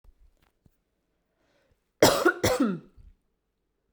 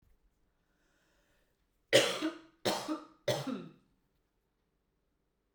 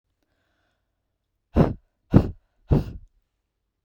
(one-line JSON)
{"cough_length": "3.9 s", "cough_amplitude": 18892, "cough_signal_mean_std_ratio": 0.3, "three_cough_length": "5.5 s", "three_cough_amplitude": 9504, "three_cough_signal_mean_std_ratio": 0.3, "exhalation_length": "3.8 s", "exhalation_amplitude": 32768, "exhalation_signal_mean_std_ratio": 0.25, "survey_phase": "beta (2021-08-13 to 2022-03-07)", "age": "18-44", "gender": "Female", "wearing_mask": "No", "symptom_none": true, "smoker_status": "Never smoked", "respiratory_condition_asthma": false, "respiratory_condition_other": false, "recruitment_source": "REACT", "submission_delay": "3 days", "covid_test_result": "Negative", "covid_test_method": "RT-qPCR"}